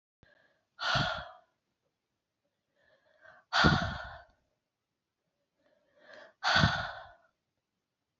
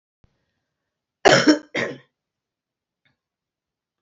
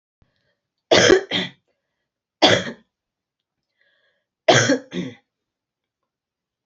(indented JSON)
{
  "exhalation_length": "8.2 s",
  "exhalation_amplitude": 10816,
  "exhalation_signal_mean_std_ratio": 0.31,
  "cough_length": "4.0 s",
  "cough_amplitude": 28482,
  "cough_signal_mean_std_ratio": 0.24,
  "three_cough_length": "6.7 s",
  "three_cough_amplitude": 29259,
  "three_cough_signal_mean_std_ratio": 0.3,
  "survey_phase": "alpha (2021-03-01 to 2021-08-12)",
  "age": "65+",
  "gender": "Female",
  "wearing_mask": "No",
  "symptom_cough_any": true,
  "symptom_fatigue": true,
  "symptom_change_to_sense_of_smell_or_taste": true,
  "symptom_loss_of_taste": true,
  "symptom_onset": "5 days",
  "smoker_status": "Never smoked",
  "respiratory_condition_asthma": false,
  "respiratory_condition_other": false,
  "recruitment_source": "Test and Trace",
  "submission_delay": "2 days",
  "covid_test_result": "Positive",
  "covid_test_method": "RT-qPCR",
  "covid_ct_value": 12.5,
  "covid_ct_gene": "ORF1ab gene",
  "covid_ct_mean": 12.9,
  "covid_viral_load": "58000000 copies/ml",
  "covid_viral_load_category": "High viral load (>1M copies/ml)"
}